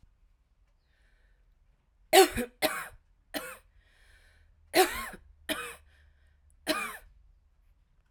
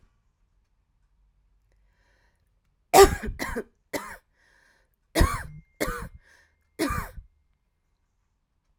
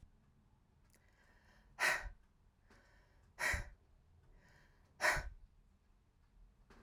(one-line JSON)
{"three_cough_length": "8.1 s", "three_cough_amplitude": 17922, "three_cough_signal_mean_std_ratio": 0.26, "cough_length": "8.8 s", "cough_amplitude": 32767, "cough_signal_mean_std_ratio": 0.23, "exhalation_length": "6.8 s", "exhalation_amplitude": 3197, "exhalation_signal_mean_std_ratio": 0.32, "survey_phase": "alpha (2021-03-01 to 2021-08-12)", "age": "45-64", "gender": "Female", "wearing_mask": "No", "symptom_cough_any": true, "symptom_new_continuous_cough": true, "symptom_shortness_of_breath": true, "symptom_fatigue": true, "symptom_headache": true, "symptom_change_to_sense_of_smell_or_taste": true, "symptom_loss_of_taste": true, "symptom_onset": "6 days", "smoker_status": "Never smoked", "respiratory_condition_asthma": false, "respiratory_condition_other": false, "recruitment_source": "Test and Trace", "submission_delay": "2 days", "covid_test_result": "Positive", "covid_test_method": "RT-qPCR", "covid_ct_value": 22.3, "covid_ct_gene": "ORF1ab gene", "covid_ct_mean": 22.7, "covid_viral_load": "37000 copies/ml", "covid_viral_load_category": "Low viral load (10K-1M copies/ml)"}